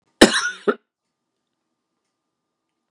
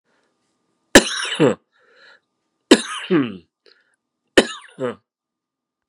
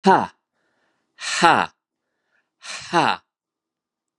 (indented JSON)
{
  "cough_length": "2.9 s",
  "cough_amplitude": 32768,
  "cough_signal_mean_std_ratio": 0.21,
  "three_cough_length": "5.9 s",
  "three_cough_amplitude": 32768,
  "three_cough_signal_mean_std_ratio": 0.27,
  "exhalation_length": "4.2 s",
  "exhalation_amplitude": 32767,
  "exhalation_signal_mean_std_ratio": 0.31,
  "survey_phase": "beta (2021-08-13 to 2022-03-07)",
  "age": "65+",
  "gender": "Male",
  "wearing_mask": "No",
  "symptom_cough_any": true,
  "symptom_new_continuous_cough": true,
  "symptom_runny_or_blocked_nose": true,
  "symptom_sore_throat": true,
  "symptom_fatigue": true,
  "symptom_headache": true,
  "smoker_status": "Never smoked",
  "respiratory_condition_asthma": false,
  "respiratory_condition_other": false,
  "recruitment_source": "Test and Trace",
  "submission_delay": "0 days",
  "covid_test_result": "Positive",
  "covid_test_method": "LFT"
}